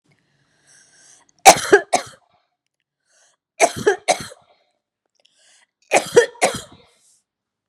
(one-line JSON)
{"three_cough_length": "7.7 s", "three_cough_amplitude": 32768, "three_cough_signal_mean_std_ratio": 0.25, "survey_phase": "beta (2021-08-13 to 2022-03-07)", "age": "18-44", "gender": "Female", "wearing_mask": "No", "symptom_none": true, "smoker_status": "Never smoked", "respiratory_condition_asthma": false, "respiratory_condition_other": false, "recruitment_source": "REACT", "submission_delay": "1 day", "covid_test_result": "Negative", "covid_test_method": "RT-qPCR", "influenza_a_test_result": "Negative", "influenza_b_test_result": "Negative"}